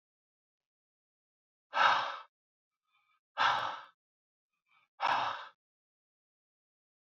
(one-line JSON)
{"exhalation_length": "7.2 s", "exhalation_amplitude": 7322, "exhalation_signal_mean_std_ratio": 0.31, "survey_phase": "beta (2021-08-13 to 2022-03-07)", "age": "45-64", "gender": "Male", "wearing_mask": "No", "symptom_none": true, "smoker_status": "Never smoked", "respiratory_condition_asthma": false, "respiratory_condition_other": false, "recruitment_source": "REACT", "submission_delay": "2 days", "covid_test_result": "Negative", "covid_test_method": "RT-qPCR"}